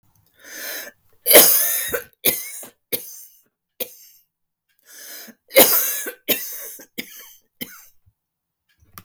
{"cough_length": "9.0 s", "cough_amplitude": 32768, "cough_signal_mean_std_ratio": 0.33, "survey_phase": "beta (2021-08-13 to 2022-03-07)", "age": "65+", "gender": "Female", "wearing_mask": "No", "symptom_none": true, "smoker_status": "Never smoked", "respiratory_condition_asthma": false, "respiratory_condition_other": false, "recruitment_source": "REACT", "submission_delay": "1 day", "covid_test_result": "Negative", "covid_test_method": "RT-qPCR"}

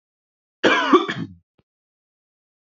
{"cough_length": "2.7 s", "cough_amplitude": 27468, "cough_signal_mean_std_ratio": 0.32, "survey_phase": "beta (2021-08-13 to 2022-03-07)", "age": "18-44", "gender": "Male", "wearing_mask": "No", "symptom_none": true, "smoker_status": "Ex-smoker", "respiratory_condition_asthma": false, "respiratory_condition_other": false, "recruitment_source": "REACT", "submission_delay": "0 days", "covid_test_result": "Negative", "covid_test_method": "RT-qPCR", "influenza_a_test_result": "Negative", "influenza_b_test_result": "Negative"}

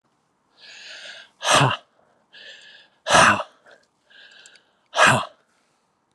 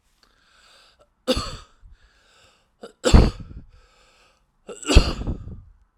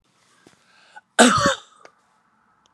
{"exhalation_length": "6.1 s", "exhalation_amplitude": 28284, "exhalation_signal_mean_std_ratio": 0.33, "three_cough_length": "6.0 s", "three_cough_amplitude": 32768, "three_cough_signal_mean_std_ratio": 0.27, "cough_length": "2.7 s", "cough_amplitude": 31969, "cough_signal_mean_std_ratio": 0.29, "survey_phase": "alpha (2021-03-01 to 2021-08-12)", "age": "45-64", "gender": "Male", "wearing_mask": "No", "symptom_none": true, "symptom_onset": "12 days", "smoker_status": "Never smoked", "respiratory_condition_asthma": false, "respiratory_condition_other": false, "recruitment_source": "REACT", "submission_delay": "2 days", "covid_test_result": "Negative", "covid_test_method": "RT-qPCR"}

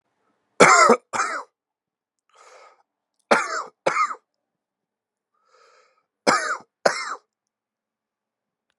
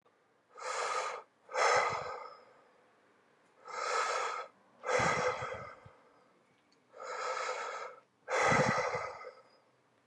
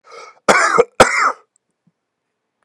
{"three_cough_length": "8.8 s", "three_cough_amplitude": 32767, "three_cough_signal_mean_std_ratio": 0.29, "exhalation_length": "10.1 s", "exhalation_amplitude": 5121, "exhalation_signal_mean_std_ratio": 0.56, "cough_length": "2.6 s", "cough_amplitude": 32768, "cough_signal_mean_std_ratio": 0.39, "survey_phase": "beta (2021-08-13 to 2022-03-07)", "age": "18-44", "gender": "Male", "wearing_mask": "No", "symptom_runny_or_blocked_nose": true, "symptom_shortness_of_breath": true, "symptom_fatigue": true, "symptom_fever_high_temperature": true, "symptom_headache": true, "smoker_status": "Current smoker (11 or more cigarettes per day)", "respiratory_condition_asthma": true, "respiratory_condition_other": true, "recruitment_source": "Test and Trace", "submission_delay": "2 days", "covid_test_result": "Positive", "covid_test_method": "RT-qPCR", "covid_ct_value": 13.3, "covid_ct_gene": "ORF1ab gene", "covid_ct_mean": 14.1, "covid_viral_load": "23000000 copies/ml", "covid_viral_load_category": "High viral load (>1M copies/ml)"}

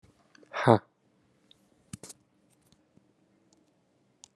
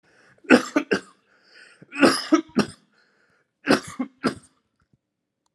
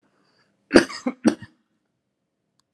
{"exhalation_length": "4.4 s", "exhalation_amplitude": 22391, "exhalation_signal_mean_std_ratio": 0.15, "three_cough_length": "5.5 s", "three_cough_amplitude": 31639, "three_cough_signal_mean_std_ratio": 0.31, "cough_length": "2.7 s", "cough_amplitude": 32768, "cough_signal_mean_std_ratio": 0.21, "survey_phase": "alpha (2021-03-01 to 2021-08-12)", "age": "45-64", "gender": "Male", "wearing_mask": "No", "symptom_cough_any": true, "symptom_fatigue": true, "symptom_headache": true, "symptom_onset": "7 days", "smoker_status": "Ex-smoker", "respiratory_condition_asthma": false, "respiratory_condition_other": false, "recruitment_source": "Test and Trace", "submission_delay": "2 days", "covid_test_result": "Positive", "covid_test_method": "RT-qPCR", "covid_ct_value": 21.9, "covid_ct_gene": "ORF1ab gene", "covid_ct_mean": 22.9, "covid_viral_load": "32000 copies/ml", "covid_viral_load_category": "Low viral load (10K-1M copies/ml)"}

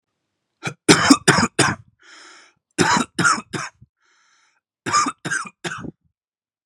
{"three_cough_length": "6.7 s", "three_cough_amplitude": 32768, "three_cough_signal_mean_std_ratio": 0.38, "survey_phase": "beta (2021-08-13 to 2022-03-07)", "age": "18-44", "gender": "Male", "wearing_mask": "No", "symptom_none": true, "smoker_status": "Never smoked", "respiratory_condition_asthma": false, "respiratory_condition_other": false, "recruitment_source": "REACT", "submission_delay": "2 days", "covid_test_result": "Negative", "covid_test_method": "RT-qPCR", "covid_ct_value": 37.0, "covid_ct_gene": "N gene", "influenza_a_test_result": "Negative", "influenza_b_test_result": "Negative"}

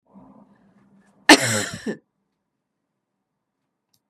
{"cough_length": "4.1 s", "cough_amplitude": 32768, "cough_signal_mean_std_ratio": 0.2, "survey_phase": "beta (2021-08-13 to 2022-03-07)", "age": "65+", "gender": "Female", "wearing_mask": "No", "symptom_none": true, "smoker_status": "Ex-smoker", "respiratory_condition_asthma": false, "respiratory_condition_other": false, "recruitment_source": "REACT", "submission_delay": "2 days", "covid_test_result": "Negative", "covid_test_method": "RT-qPCR", "influenza_a_test_result": "Negative", "influenza_b_test_result": "Negative"}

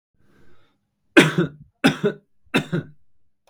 {"three_cough_length": "3.5 s", "three_cough_amplitude": 32768, "three_cough_signal_mean_std_ratio": 0.33, "survey_phase": "beta (2021-08-13 to 2022-03-07)", "age": "18-44", "gender": "Male", "wearing_mask": "No", "symptom_prefer_not_to_say": true, "smoker_status": "Never smoked", "respiratory_condition_asthma": false, "respiratory_condition_other": false, "recruitment_source": "REACT", "submission_delay": "2 days", "covid_test_result": "Negative", "covid_test_method": "RT-qPCR"}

